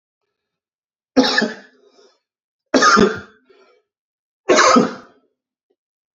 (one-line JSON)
{"three_cough_length": "6.1 s", "three_cough_amplitude": 32768, "three_cough_signal_mean_std_ratio": 0.35, "survey_phase": "beta (2021-08-13 to 2022-03-07)", "age": "18-44", "gender": "Male", "wearing_mask": "No", "symptom_runny_or_blocked_nose": true, "symptom_sore_throat": true, "symptom_fatigue": true, "symptom_onset": "2 days", "smoker_status": "Current smoker (1 to 10 cigarettes per day)", "respiratory_condition_asthma": false, "respiratory_condition_other": false, "recruitment_source": "REACT", "submission_delay": "-1 day", "covid_test_result": "Negative", "covid_test_method": "RT-qPCR", "influenza_a_test_result": "Negative", "influenza_b_test_result": "Negative"}